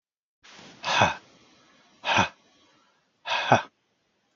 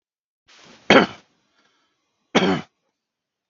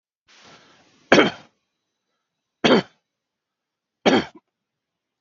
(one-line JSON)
{"exhalation_length": "4.4 s", "exhalation_amplitude": 24625, "exhalation_signal_mean_std_ratio": 0.33, "cough_length": "3.5 s", "cough_amplitude": 32768, "cough_signal_mean_std_ratio": 0.25, "three_cough_length": "5.2 s", "three_cough_amplitude": 32768, "three_cough_signal_mean_std_ratio": 0.25, "survey_phase": "beta (2021-08-13 to 2022-03-07)", "age": "45-64", "gender": "Male", "wearing_mask": "No", "symptom_none": true, "symptom_onset": "4 days", "smoker_status": "Never smoked", "respiratory_condition_asthma": false, "respiratory_condition_other": false, "recruitment_source": "REACT", "submission_delay": "1 day", "covid_test_result": "Negative", "covid_test_method": "RT-qPCR", "influenza_a_test_result": "Negative", "influenza_b_test_result": "Negative"}